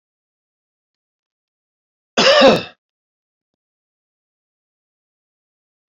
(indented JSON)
{
  "cough_length": "5.9 s",
  "cough_amplitude": 30424,
  "cough_signal_mean_std_ratio": 0.22,
  "survey_phase": "beta (2021-08-13 to 2022-03-07)",
  "age": "65+",
  "gender": "Male",
  "wearing_mask": "No",
  "symptom_cough_any": true,
  "symptom_runny_or_blocked_nose": true,
  "symptom_loss_of_taste": true,
  "symptom_onset": "4 days",
  "smoker_status": "Ex-smoker",
  "respiratory_condition_asthma": false,
  "respiratory_condition_other": false,
  "recruitment_source": "Test and Trace",
  "submission_delay": "2 days",
  "covid_test_result": "Positive",
  "covid_test_method": "RT-qPCR",
  "covid_ct_value": 13.5,
  "covid_ct_gene": "ORF1ab gene",
  "covid_ct_mean": 13.7,
  "covid_viral_load": "31000000 copies/ml",
  "covid_viral_load_category": "High viral load (>1M copies/ml)"
}